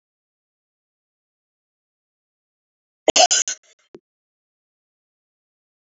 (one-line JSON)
{"cough_length": "5.8 s", "cough_amplitude": 29645, "cough_signal_mean_std_ratio": 0.17, "survey_phase": "beta (2021-08-13 to 2022-03-07)", "age": "45-64", "gender": "Female", "wearing_mask": "No", "symptom_cough_any": true, "symptom_runny_or_blocked_nose": true, "symptom_shortness_of_breath": true, "symptom_sore_throat": true, "symptom_abdominal_pain": true, "symptom_diarrhoea": true, "symptom_headache": true, "symptom_onset": "3 days", "smoker_status": "Never smoked", "respiratory_condition_asthma": false, "respiratory_condition_other": false, "recruitment_source": "Test and Trace", "submission_delay": "2 days", "covid_test_result": "Positive", "covid_test_method": "RT-qPCR", "covid_ct_value": 16.5, "covid_ct_gene": "ORF1ab gene", "covid_ct_mean": 16.9, "covid_viral_load": "2900000 copies/ml", "covid_viral_load_category": "High viral load (>1M copies/ml)"}